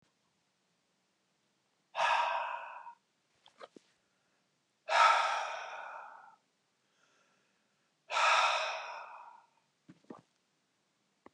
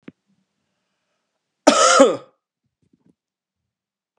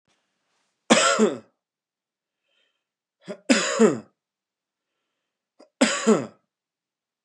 {"exhalation_length": "11.3 s", "exhalation_amplitude": 6910, "exhalation_signal_mean_std_ratio": 0.36, "cough_length": "4.2 s", "cough_amplitude": 32768, "cough_signal_mean_std_ratio": 0.26, "three_cough_length": "7.2 s", "three_cough_amplitude": 26219, "three_cough_signal_mean_std_ratio": 0.31, "survey_phase": "beta (2021-08-13 to 2022-03-07)", "age": "45-64", "gender": "Male", "wearing_mask": "No", "symptom_new_continuous_cough": true, "symptom_runny_or_blocked_nose": true, "symptom_sore_throat": true, "symptom_fever_high_temperature": true, "symptom_change_to_sense_of_smell_or_taste": true, "symptom_loss_of_taste": true, "smoker_status": "Never smoked", "respiratory_condition_asthma": false, "respiratory_condition_other": false, "recruitment_source": "REACT", "submission_delay": "4 days", "covid_test_result": "Positive", "covid_test_method": "RT-qPCR", "covid_ct_value": 18.0, "covid_ct_gene": "E gene", "influenza_a_test_result": "Negative", "influenza_b_test_result": "Negative"}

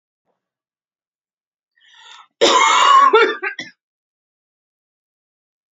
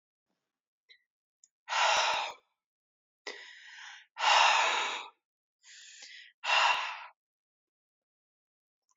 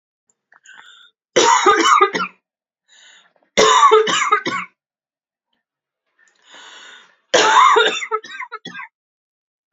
{"cough_length": "5.7 s", "cough_amplitude": 29611, "cough_signal_mean_std_ratio": 0.35, "exhalation_length": "9.0 s", "exhalation_amplitude": 8472, "exhalation_signal_mean_std_ratio": 0.39, "three_cough_length": "9.7 s", "three_cough_amplitude": 32767, "three_cough_signal_mean_std_ratio": 0.43, "survey_phase": "beta (2021-08-13 to 2022-03-07)", "age": "18-44", "gender": "Female", "wearing_mask": "No", "symptom_new_continuous_cough": true, "symptom_runny_or_blocked_nose": true, "symptom_shortness_of_breath": true, "symptom_abdominal_pain": true, "symptom_onset": "3 days", "smoker_status": "Never smoked", "respiratory_condition_asthma": true, "respiratory_condition_other": false, "recruitment_source": "REACT", "submission_delay": "2 days", "covid_test_result": "Negative", "covid_test_method": "RT-qPCR", "influenza_a_test_result": "Negative", "influenza_b_test_result": "Negative"}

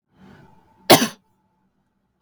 {"cough_length": "2.2 s", "cough_amplitude": 32768, "cough_signal_mean_std_ratio": 0.21, "survey_phase": "beta (2021-08-13 to 2022-03-07)", "age": "18-44", "gender": "Female", "wearing_mask": "No", "symptom_none": true, "smoker_status": "Never smoked", "respiratory_condition_asthma": true, "respiratory_condition_other": false, "recruitment_source": "REACT", "submission_delay": "1 day", "covid_test_result": "Negative", "covid_test_method": "RT-qPCR", "influenza_a_test_result": "Unknown/Void", "influenza_b_test_result": "Unknown/Void"}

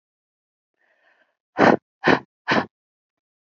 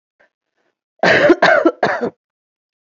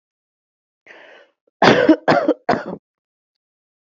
{"exhalation_length": "3.4 s", "exhalation_amplitude": 27573, "exhalation_signal_mean_std_ratio": 0.27, "cough_length": "2.8 s", "cough_amplitude": 29328, "cough_signal_mean_std_ratio": 0.44, "three_cough_length": "3.8 s", "three_cough_amplitude": 28352, "three_cough_signal_mean_std_ratio": 0.34, "survey_phase": "alpha (2021-03-01 to 2021-08-12)", "age": "45-64", "gender": "Female", "wearing_mask": "No", "symptom_none": true, "smoker_status": "Current smoker (11 or more cigarettes per day)", "respiratory_condition_asthma": false, "respiratory_condition_other": false, "recruitment_source": "REACT", "submission_delay": "1 day", "covid_test_result": "Negative", "covid_test_method": "RT-qPCR"}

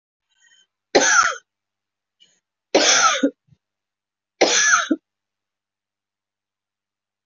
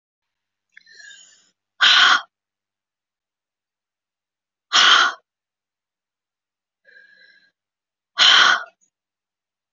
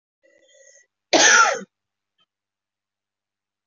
{"three_cough_length": "7.3 s", "three_cough_amplitude": 26232, "three_cough_signal_mean_std_ratio": 0.36, "exhalation_length": "9.7 s", "exhalation_amplitude": 30099, "exhalation_signal_mean_std_ratio": 0.29, "cough_length": "3.7 s", "cough_amplitude": 24909, "cough_signal_mean_std_ratio": 0.28, "survey_phase": "beta (2021-08-13 to 2022-03-07)", "age": "45-64", "gender": "Female", "wearing_mask": "No", "symptom_runny_or_blocked_nose": true, "symptom_sore_throat": true, "symptom_fatigue": true, "symptom_other": true, "symptom_onset": "6 days", "smoker_status": "Never smoked", "respiratory_condition_asthma": false, "respiratory_condition_other": false, "recruitment_source": "Test and Trace", "submission_delay": "2 days", "covid_test_result": "Positive", "covid_test_method": "ePCR"}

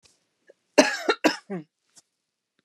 {"cough_length": "2.6 s", "cough_amplitude": 29660, "cough_signal_mean_std_ratio": 0.27, "survey_phase": "beta (2021-08-13 to 2022-03-07)", "age": "45-64", "gender": "Female", "wearing_mask": "No", "symptom_none": true, "smoker_status": "Never smoked", "respiratory_condition_asthma": false, "respiratory_condition_other": false, "recruitment_source": "REACT", "submission_delay": "1 day", "covid_test_result": "Negative", "covid_test_method": "RT-qPCR", "influenza_a_test_result": "Negative", "influenza_b_test_result": "Negative"}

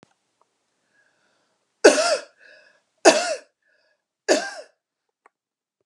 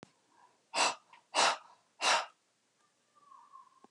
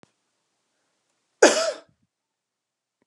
{"three_cough_length": "5.9 s", "three_cough_amplitude": 32660, "three_cough_signal_mean_std_ratio": 0.26, "exhalation_length": "3.9 s", "exhalation_amplitude": 6169, "exhalation_signal_mean_std_ratio": 0.34, "cough_length": "3.1 s", "cough_amplitude": 29540, "cough_signal_mean_std_ratio": 0.21, "survey_phase": "beta (2021-08-13 to 2022-03-07)", "age": "45-64", "gender": "Female", "wearing_mask": "No", "symptom_none": true, "smoker_status": "Ex-smoker", "respiratory_condition_asthma": false, "respiratory_condition_other": false, "recruitment_source": "REACT", "submission_delay": "2 days", "covid_test_result": "Negative", "covid_test_method": "RT-qPCR"}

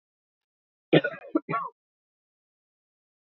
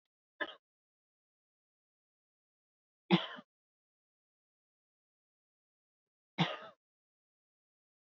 {"cough_length": "3.3 s", "cough_amplitude": 19057, "cough_signal_mean_std_ratio": 0.22, "three_cough_length": "8.0 s", "three_cough_amplitude": 7191, "three_cough_signal_mean_std_ratio": 0.15, "survey_phase": "beta (2021-08-13 to 2022-03-07)", "age": "45-64", "gender": "Female", "wearing_mask": "No", "symptom_none": true, "smoker_status": "Ex-smoker", "respiratory_condition_asthma": false, "respiratory_condition_other": false, "recruitment_source": "REACT", "submission_delay": "2 days", "covid_test_result": "Negative", "covid_test_method": "RT-qPCR", "influenza_a_test_result": "Negative", "influenza_b_test_result": "Negative"}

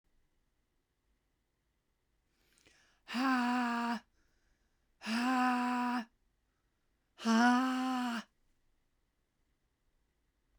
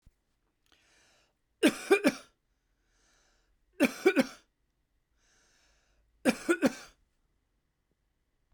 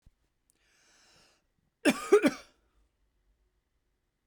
{"exhalation_length": "10.6 s", "exhalation_amplitude": 4334, "exhalation_signal_mean_std_ratio": 0.45, "three_cough_length": "8.5 s", "three_cough_amplitude": 10147, "three_cough_signal_mean_std_ratio": 0.25, "cough_length": "4.3 s", "cough_amplitude": 10725, "cough_signal_mean_std_ratio": 0.21, "survey_phase": "beta (2021-08-13 to 2022-03-07)", "age": "45-64", "gender": "Female", "wearing_mask": "No", "symptom_cough_any": true, "symptom_shortness_of_breath": true, "symptom_onset": "8 days", "smoker_status": "Never smoked", "respiratory_condition_asthma": true, "respiratory_condition_other": false, "recruitment_source": "Test and Trace", "submission_delay": "1 day", "covid_test_result": "Positive", "covid_test_method": "RT-qPCR", "covid_ct_value": 24.8, "covid_ct_gene": "N gene"}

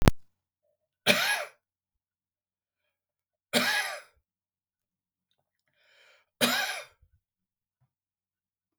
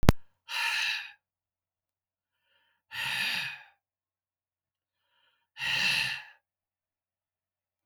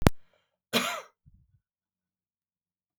{"three_cough_length": "8.8 s", "three_cough_amplitude": 32768, "three_cough_signal_mean_std_ratio": 0.28, "exhalation_length": "7.9 s", "exhalation_amplitude": 32768, "exhalation_signal_mean_std_ratio": 0.35, "cough_length": "3.0 s", "cough_amplitude": 32768, "cough_signal_mean_std_ratio": 0.23, "survey_phase": "beta (2021-08-13 to 2022-03-07)", "age": "65+", "gender": "Male", "wearing_mask": "No", "symptom_none": true, "smoker_status": "Never smoked", "respiratory_condition_asthma": false, "respiratory_condition_other": false, "recruitment_source": "REACT", "submission_delay": "2 days", "covid_test_result": "Negative", "covid_test_method": "RT-qPCR", "influenza_a_test_result": "Negative", "influenza_b_test_result": "Negative"}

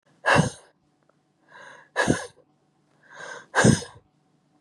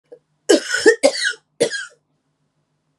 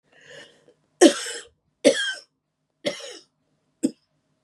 {"exhalation_length": "4.6 s", "exhalation_amplitude": 23155, "exhalation_signal_mean_std_ratio": 0.32, "cough_length": "3.0 s", "cough_amplitude": 32491, "cough_signal_mean_std_ratio": 0.37, "three_cough_length": "4.4 s", "three_cough_amplitude": 31296, "three_cough_signal_mean_std_ratio": 0.26, "survey_phase": "beta (2021-08-13 to 2022-03-07)", "age": "45-64", "gender": "Female", "wearing_mask": "No", "symptom_cough_any": true, "symptom_runny_or_blocked_nose": true, "symptom_sore_throat": true, "symptom_fatigue": true, "symptom_headache": true, "symptom_onset": "4 days", "smoker_status": "Never smoked", "respiratory_condition_asthma": false, "respiratory_condition_other": false, "recruitment_source": "Test and Trace", "submission_delay": "2 days", "covid_test_result": "Positive", "covid_test_method": "RT-qPCR", "covid_ct_value": 35.2, "covid_ct_gene": "S gene"}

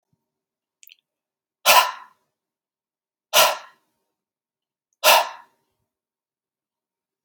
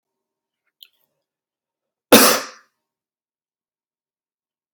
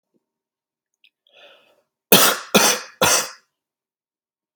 {"exhalation_length": "7.2 s", "exhalation_amplitude": 32445, "exhalation_signal_mean_std_ratio": 0.24, "cough_length": "4.7 s", "cough_amplitude": 32768, "cough_signal_mean_std_ratio": 0.19, "three_cough_length": "4.6 s", "three_cough_amplitude": 32768, "three_cough_signal_mean_std_ratio": 0.31, "survey_phase": "alpha (2021-03-01 to 2021-08-12)", "age": "18-44", "gender": "Male", "wearing_mask": "No", "symptom_none": true, "smoker_status": "Never smoked", "respiratory_condition_asthma": false, "respiratory_condition_other": false, "recruitment_source": "REACT", "submission_delay": "1 day", "covid_test_result": "Negative", "covid_test_method": "RT-qPCR"}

